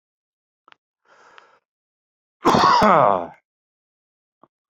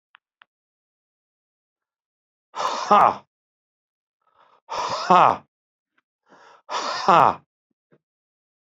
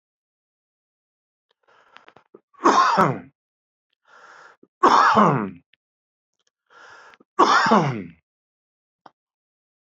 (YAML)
cough_length: 4.7 s
cough_amplitude: 25747
cough_signal_mean_std_ratio: 0.31
exhalation_length: 8.6 s
exhalation_amplitude: 27885
exhalation_signal_mean_std_ratio: 0.27
three_cough_length: 10.0 s
three_cough_amplitude: 26232
three_cough_signal_mean_std_ratio: 0.34
survey_phase: alpha (2021-03-01 to 2021-08-12)
age: 65+
gender: Male
wearing_mask: 'No'
symptom_none: true
smoker_status: Ex-smoker
respiratory_condition_asthma: false
respiratory_condition_other: false
recruitment_source: REACT
submission_delay: 2 days
covid_test_result: Negative
covid_test_method: RT-qPCR